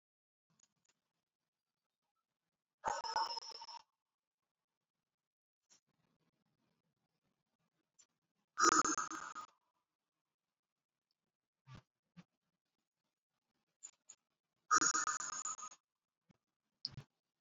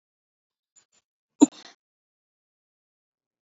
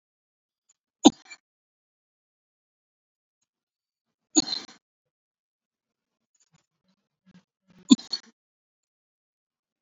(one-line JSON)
{"exhalation_length": "17.4 s", "exhalation_amplitude": 4589, "exhalation_signal_mean_std_ratio": 0.23, "cough_length": "3.4 s", "cough_amplitude": 24653, "cough_signal_mean_std_ratio": 0.09, "three_cough_length": "9.8 s", "three_cough_amplitude": 28414, "three_cough_signal_mean_std_ratio": 0.11, "survey_phase": "beta (2021-08-13 to 2022-03-07)", "age": "65+", "gender": "Male", "wearing_mask": "No", "symptom_none": true, "smoker_status": "Current smoker (e-cigarettes or vapes only)", "respiratory_condition_asthma": false, "respiratory_condition_other": true, "recruitment_source": "REACT", "submission_delay": "1 day", "covid_test_result": "Negative", "covid_test_method": "RT-qPCR"}